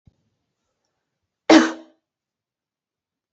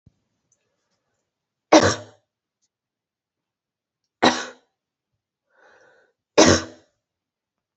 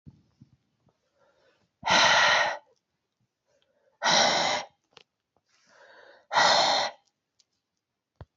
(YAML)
cough_length: 3.3 s
cough_amplitude: 29913
cough_signal_mean_std_ratio: 0.19
three_cough_length: 7.8 s
three_cough_amplitude: 28967
three_cough_signal_mean_std_ratio: 0.21
exhalation_length: 8.4 s
exhalation_amplitude: 13484
exhalation_signal_mean_std_ratio: 0.39
survey_phase: beta (2021-08-13 to 2022-03-07)
age: 45-64
gender: Female
wearing_mask: 'Yes'
symptom_cough_any: true
symptom_runny_or_blocked_nose: true
symptom_sore_throat: true
symptom_fatigue: true
symptom_headache: true
smoker_status: Never smoked
respiratory_condition_asthma: false
respiratory_condition_other: false
recruitment_source: Test and Trace
submission_delay: 1 day
covid_test_result: Positive
covid_test_method: LFT